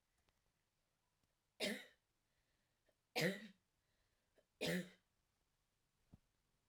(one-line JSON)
{"three_cough_length": "6.7 s", "three_cough_amplitude": 1709, "three_cough_signal_mean_std_ratio": 0.26, "survey_phase": "alpha (2021-03-01 to 2021-08-12)", "age": "18-44", "gender": "Female", "wearing_mask": "No", "symptom_cough_any": true, "symptom_fatigue": true, "smoker_status": "Ex-smoker", "respiratory_condition_asthma": false, "respiratory_condition_other": false, "recruitment_source": "Test and Trace", "submission_delay": "2 days", "covid_test_result": "Positive", "covid_test_method": "RT-qPCR"}